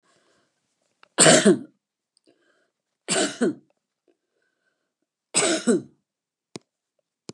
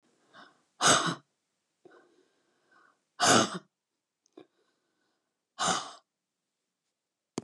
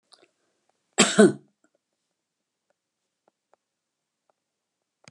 {"three_cough_length": "7.3 s", "three_cough_amplitude": 30916, "three_cough_signal_mean_std_ratio": 0.29, "exhalation_length": "7.4 s", "exhalation_amplitude": 11608, "exhalation_signal_mean_std_ratio": 0.27, "cough_length": "5.1 s", "cough_amplitude": 27556, "cough_signal_mean_std_ratio": 0.17, "survey_phase": "beta (2021-08-13 to 2022-03-07)", "age": "65+", "gender": "Female", "wearing_mask": "No", "symptom_none": true, "smoker_status": "Ex-smoker", "respiratory_condition_asthma": false, "respiratory_condition_other": false, "recruitment_source": "REACT", "submission_delay": "0 days", "covid_test_result": "Negative", "covid_test_method": "RT-qPCR", "influenza_a_test_result": "Negative", "influenza_b_test_result": "Negative"}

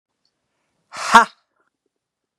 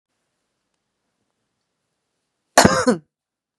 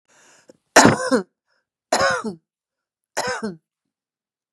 {"exhalation_length": "2.4 s", "exhalation_amplitude": 32768, "exhalation_signal_mean_std_ratio": 0.2, "cough_length": "3.6 s", "cough_amplitude": 32768, "cough_signal_mean_std_ratio": 0.22, "three_cough_length": "4.5 s", "three_cough_amplitude": 32768, "three_cough_signal_mean_std_ratio": 0.33, "survey_phase": "beta (2021-08-13 to 2022-03-07)", "age": "65+", "gender": "Female", "wearing_mask": "No", "symptom_none": true, "smoker_status": "Ex-smoker", "respiratory_condition_asthma": false, "respiratory_condition_other": false, "recruitment_source": "Test and Trace", "submission_delay": "1 day", "covid_test_result": "Negative", "covid_test_method": "RT-qPCR"}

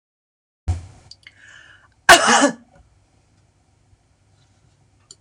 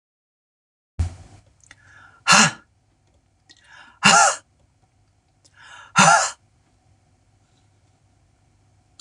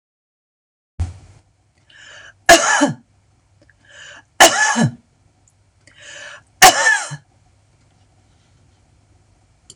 {"cough_length": "5.2 s", "cough_amplitude": 26028, "cough_signal_mean_std_ratio": 0.24, "exhalation_length": "9.0 s", "exhalation_amplitude": 26028, "exhalation_signal_mean_std_ratio": 0.27, "three_cough_length": "9.8 s", "three_cough_amplitude": 26028, "three_cough_signal_mean_std_ratio": 0.3, "survey_phase": "beta (2021-08-13 to 2022-03-07)", "age": "45-64", "gender": "Female", "wearing_mask": "No", "symptom_none": true, "symptom_onset": "6 days", "smoker_status": "Never smoked", "respiratory_condition_asthma": false, "respiratory_condition_other": false, "recruitment_source": "REACT", "submission_delay": "1 day", "covid_test_result": "Negative", "covid_test_method": "RT-qPCR"}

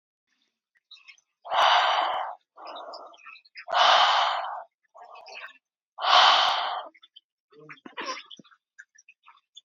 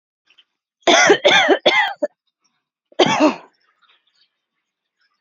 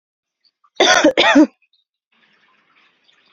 {"exhalation_length": "9.6 s", "exhalation_amplitude": 18638, "exhalation_signal_mean_std_ratio": 0.43, "three_cough_length": "5.2 s", "three_cough_amplitude": 30607, "three_cough_signal_mean_std_ratio": 0.4, "cough_length": "3.3 s", "cough_amplitude": 29772, "cough_signal_mean_std_ratio": 0.35, "survey_phase": "beta (2021-08-13 to 2022-03-07)", "age": "18-44", "gender": "Female", "wearing_mask": "No", "symptom_none": true, "smoker_status": "Never smoked", "respiratory_condition_asthma": false, "respiratory_condition_other": false, "recruitment_source": "REACT", "submission_delay": "7 days", "covid_test_result": "Negative", "covid_test_method": "RT-qPCR", "influenza_a_test_result": "Negative", "influenza_b_test_result": "Negative"}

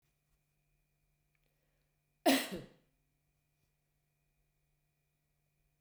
{"cough_length": "5.8 s", "cough_amplitude": 5533, "cough_signal_mean_std_ratio": 0.16, "survey_phase": "beta (2021-08-13 to 2022-03-07)", "age": "65+", "gender": "Female", "wearing_mask": "No", "symptom_none": true, "smoker_status": "Never smoked", "respiratory_condition_asthma": false, "respiratory_condition_other": false, "recruitment_source": "REACT", "submission_delay": "1 day", "covid_test_result": "Negative", "covid_test_method": "RT-qPCR", "influenza_a_test_result": "Negative", "influenza_b_test_result": "Negative"}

